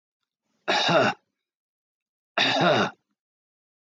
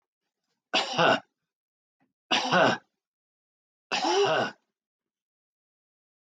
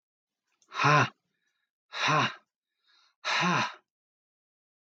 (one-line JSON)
{"cough_length": "3.8 s", "cough_amplitude": 14909, "cough_signal_mean_std_ratio": 0.42, "three_cough_length": "6.4 s", "three_cough_amplitude": 11695, "three_cough_signal_mean_std_ratio": 0.37, "exhalation_length": "4.9 s", "exhalation_amplitude": 9377, "exhalation_signal_mean_std_ratio": 0.38, "survey_phase": "beta (2021-08-13 to 2022-03-07)", "age": "45-64", "gender": "Male", "wearing_mask": "No", "symptom_none": true, "smoker_status": "Never smoked", "respiratory_condition_asthma": false, "respiratory_condition_other": false, "recruitment_source": "REACT", "submission_delay": "5 days", "covid_test_result": "Negative", "covid_test_method": "RT-qPCR", "influenza_a_test_result": "Negative", "influenza_b_test_result": "Negative"}